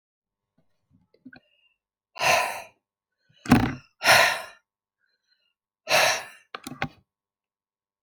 {"exhalation_length": "8.0 s", "exhalation_amplitude": 24866, "exhalation_signal_mean_std_ratio": 0.31, "survey_phase": "alpha (2021-03-01 to 2021-08-12)", "age": "65+", "gender": "Female", "wearing_mask": "No", "symptom_fatigue": true, "symptom_onset": "12 days", "smoker_status": "Never smoked", "respiratory_condition_asthma": false, "respiratory_condition_other": false, "recruitment_source": "REACT", "submission_delay": "2 days", "covid_test_result": "Negative", "covid_test_method": "RT-qPCR"}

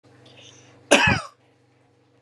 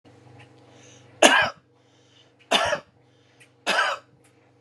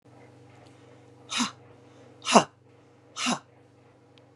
{"cough_length": "2.2 s", "cough_amplitude": 32767, "cough_signal_mean_std_ratio": 0.3, "three_cough_length": "4.6 s", "three_cough_amplitude": 32768, "three_cough_signal_mean_std_ratio": 0.33, "exhalation_length": "4.4 s", "exhalation_amplitude": 30517, "exhalation_signal_mean_std_ratio": 0.26, "survey_phase": "beta (2021-08-13 to 2022-03-07)", "age": "45-64", "gender": "Female", "wearing_mask": "No", "symptom_other": true, "symptom_onset": "12 days", "smoker_status": "Never smoked", "respiratory_condition_asthma": false, "respiratory_condition_other": false, "recruitment_source": "REACT", "submission_delay": "0 days", "covid_test_result": "Negative", "covid_test_method": "RT-qPCR"}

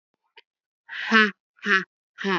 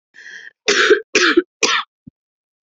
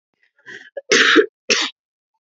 {"exhalation_length": "2.4 s", "exhalation_amplitude": 32052, "exhalation_signal_mean_std_ratio": 0.35, "three_cough_length": "2.6 s", "three_cough_amplitude": 32768, "three_cough_signal_mean_std_ratio": 0.44, "cough_length": "2.2 s", "cough_amplitude": 32767, "cough_signal_mean_std_ratio": 0.4, "survey_phase": "beta (2021-08-13 to 2022-03-07)", "age": "18-44", "gender": "Female", "wearing_mask": "No", "symptom_cough_any": true, "symptom_runny_or_blocked_nose": true, "symptom_sore_throat": true, "symptom_headache": true, "symptom_onset": "9 days", "smoker_status": "Current smoker (1 to 10 cigarettes per day)", "respiratory_condition_asthma": false, "respiratory_condition_other": false, "recruitment_source": "REACT", "submission_delay": "1 day", "covid_test_result": "Negative", "covid_test_method": "RT-qPCR", "influenza_a_test_result": "Negative", "influenza_b_test_result": "Negative"}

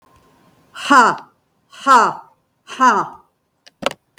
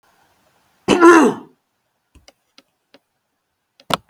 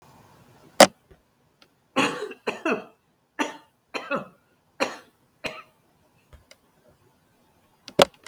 {"exhalation_length": "4.2 s", "exhalation_amplitude": 32766, "exhalation_signal_mean_std_ratio": 0.37, "cough_length": "4.1 s", "cough_amplitude": 32768, "cough_signal_mean_std_ratio": 0.28, "three_cough_length": "8.3 s", "three_cough_amplitude": 32768, "three_cough_signal_mean_std_ratio": 0.22, "survey_phase": "beta (2021-08-13 to 2022-03-07)", "age": "65+", "gender": "Female", "wearing_mask": "No", "symptom_none": true, "smoker_status": "Ex-smoker", "respiratory_condition_asthma": false, "respiratory_condition_other": false, "recruitment_source": "REACT", "submission_delay": "1 day", "covid_test_result": "Negative", "covid_test_method": "RT-qPCR", "influenza_a_test_result": "Negative", "influenza_b_test_result": "Negative"}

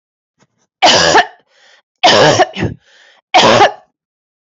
{"three_cough_length": "4.4 s", "three_cough_amplitude": 31508, "three_cough_signal_mean_std_ratio": 0.5, "survey_phase": "beta (2021-08-13 to 2022-03-07)", "age": "45-64", "gender": "Female", "wearing_mask": "No", "symptom_runny_or_blocked_nose": true, "symptom_shortness_of_breath": true, "symptom_abdominal_pain": true, "symptom_onset": "2 days", "smoker_status": "Never smoked", "respiratory_condition_asthma": false, "respiratory_condition_other": false, "recruitment_source": "Test and Trace", "submission_delay": "1 day", "covid_test_result": "Positive", "covid_test_method": "RT-qPCR", "covid_ct_value": 18.6, "covid_ct_gene": "ORF1ab gene", "covid_ct_mean": 18.8, "covid_viral_load": "670000 copies/ml", "covid_viral_load_category": "Low viral load (10K-1M copies/ml)"}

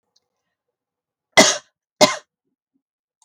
{"cough_length": "3.2 s", "cough_amplitude": 32768, "cough_signal_mean_std_ratio": 0.22, "survey_phase": "beta (2021-08-13 to 2022-03-07)", "age": "45-64", "gender": "Female", "wearing_mask": "No", "symptom_none": true, "smoker_status": "Never smoked", "respiratory_condition_asthma": false, "respiratory_condition_other": false, "recruitment_source": "Test and Trace", "submission_delay": "2 days", "covid_test_result": "Negative", "covid_test_method": "RT-qPCR"}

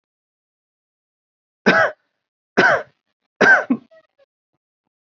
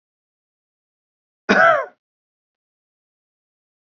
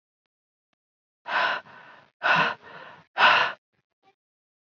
{"three_cough_length": "5.0 s", "three_cough_amplitude": 29105, "three_cough_signal_mean_std_ratio": 0.31, "cough_length": "3.9 s", "cough_amplitude": 27361, "cough_signal_mean_std_ratio": 0.23, "exhalation_length": "4.6 s", "exhalation_amplitude": 16992, "exhalation_signal_mean_std_ratio": 0.36, "survey_phase": "beta (2021-08-13 to 2022-03-07)", "age": "18-44", "gender": "Male", "wearing_mask": "No", "symptom_none": true, "smoker_status": "Never smoked", "respiratory_condition_asthma": false, "respiratory_condition_other": false, "recruitment_source": "REACT", "submission_delay": "3 days", "covid_test_result": "Negative", "covid_test_method": "RT-qPCR", "influenza_a_test_result": "Negative", "influenza_b_test_result": "Negative"}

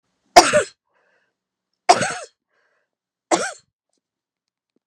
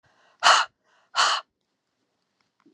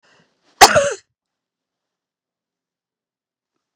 {"three_cough_length": "4.9 s", "three_cough_amplitude": 32768, "three_cough_signal_mean_std_ratio": 0.24, "exhalation_length": "2.7 s", "exhalation_amplitude": 24299, "exhalation_signal_mean_std_ratio": 0.31, "cough_length": "3.8 s", "cough_amplitude": 32768, "cough_signal_mean_std_ratio": 0.19, "survey_phase": "beta (2021-08-13 to 2022-03-07)", "age": "45-64", "gender": "Female", "wearing_mask": "No", "symptom_runny_or_blocked_nose": true, "symptom_diarrhoea": true, "symptom_fatigue": true, "symptom_headache": true, "smoker_status": "Never smoked", "respiratory_condition_asthma": false, "respiratory_condition_other": false, "recruitment_source": "Test and Trace", "submission_delay": "2 days", "covid_test_result": "Positive", "covid_test_method": "RT-qPCR", "covid_ct_value": 26.6, "covid_ct_gene": "N gene", "covid_ct_mean": 26.7, "covid_viral_load": "1800 copies/ml", "covid_viral_load_category": "Minimal viral load (< 10K copies/ml)"}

